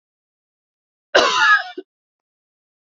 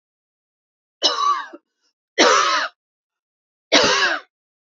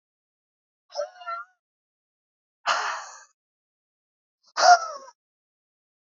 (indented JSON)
{
  "cough_length": "2.8 s",
  "cough_amplitude": 28863,
  "cough_signal_mean_std_ratio": 0.34,
  "three_cough_length": "4.6 s",
  "three_cough_amplitude": 31155,
  "three_cough_signal_mean_std_ratio": 0.44,
  "exhalation_length": "6.1 s",
  "exhalation_amplitude": 22593,
  "exhalation_signal_mean_std_ratio": 0.24,
  "survey_phase": "beta (2021-08-13 to 2022-03-07)",
  "age": "45-64",
  "gender": "Female",
  "wearing_mask": "No",
  "symptom_cough_any": true,
  "symptom_runny_or_blocked_nose": true,
  "symptom_sore_throat": true,
  "symptom_abdominal_pain": true,
  "symptom_fatigue": true,
  "symptom_headache": true,
  "symptom_change_to_sense_of_smell_or_taste": true,
  "symptom_other": true,
  "symptom_onset": "4 days",
  "smoker_status": "Ex-smoker",
  "respiratory_condition_asthma": false,
  "respiratory_condition_other": false,
  "recruitment_source": "Test and Trace",
  "submission_delay": "2 days",
  "covid_test_result": "Positive",
  "covid_test_method": "RT-qPCR",
  "covid_ct_value": 33.4,
  "covid_ct_gene": "N gene"
}